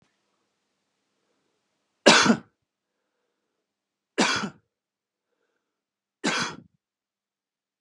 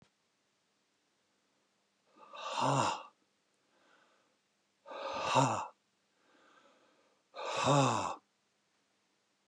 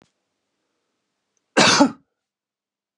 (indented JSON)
{
  "three_cough_length": "7.8 s",
  "three_cough_amplitude": 29903,
  "three_cough_signal_mean_std_ratio": 0.23,
  "exhalation_length": "9.5 s",
  "exhalation_amplitude": 5970,
  "exhalation_signal_mean_std_ratio": 0.36,
  "cough_length": "3.0 s",
  "cough_amplitude": 30520,
  "cough_signal_mean_std_ratio": 0.27,
  "survey_phase": "beta (2021-08-13 to 2022-03-07)",
  "age": "45-64",
  "gender": "Male",
  "wearing_mask": "No",
  "symptom_none": true,
  "smoker_status": "Ex-smoker",
  "respiratory_condition_asthma": false,
  "respiratory_condition_other": false,
  "recruitment_source": "REACT",
  "submission_delay": "2 days",
  "covid_test_result": "Negative",
  "covid_test_method": "RT-qPCR",
  "influenza_a_test_result": "Negative",
  "influenza_b_test_result": "Negative"
}